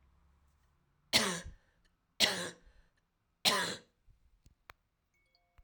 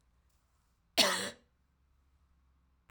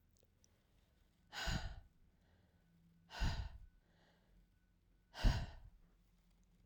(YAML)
three_cough_length: 5.6 s
three_cough_amplitude: 10482
three_cough_signal_mean_std_ratio: 0.3
cough_length: 2.9 s
cough_amplitude: 9207
cough_signal_mean_std_ratio: 0.25
exhalation_length: 6.7 s
exhalation_amplitude: 2796
exhalation_signal_mean_std_ratio: 0.32
survey_phase: beta (2021-08-13 to 2022-03-07)
age: 65+
gender: Female
wearing_mask: 'No'
symptom_cough_any: true
symptom_new_continuous_cough: true
symptom_runny_or_blocked_nose: true
symptom_fatigue: true
symptom_fever_high_temperature: true
symptom_headache: true
symptom_change_to_sense_of_smell_or_taste: true
symptom_onset: 3 days
smoker_status: Never smoked
respiratory_condition_asthma: false
respiratory_condition_other: false
recruitment_source: Test and Trace
submission_delay: 0 days
covid_test_result: Positive
covid_test_method: RT-qPCR
covid_ct_value: 17.9
covid_ct_gene: ORF1ab gene
covid_ct_mean: 18.2
covid_viral_load: 1100000 copies/ml
covid_viral_load_category: High viral load (>1M copies/ml)